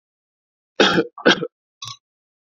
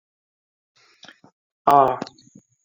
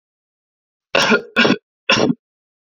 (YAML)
cough_length: 2.6 s
cough_amplitude: 28089
cough_signal_mean_std_ratio: 0.31
exhalation_length: 2.6 s
exhalation_amplitude: 27307
exhalation_signal_mean_std_ratio: 0.25
three_cough_length: 2.6 s
three_cough_amplitude: 30451
three_cough_signal_mean_std_ratio: 0.41
survey_phase: alpha (2021-03-01 to 2021-08-12)
age: 18-44
gender: Male
wearing_mask: 'No'
symptom_fatigue: true
symptom_fever_high_temperature: true
symptom_onset: 3 days
smoker_status: Never smoked
respiratory_condition_asthma: false
respiratory_condition_other: false
recruitment_source: Test and Trace
submission_delay: 2 days
covid_test_result: Positive
covid_test_method: RT-qPCR
covid_ct_value: 28.3
covid_ct_gene: ORF1ab gene
covid_ct_mean: 28.4
covid_viral_load: 470 copies/ml
covid_viral_load_category: Minimal viral load (< 10K copies/ml)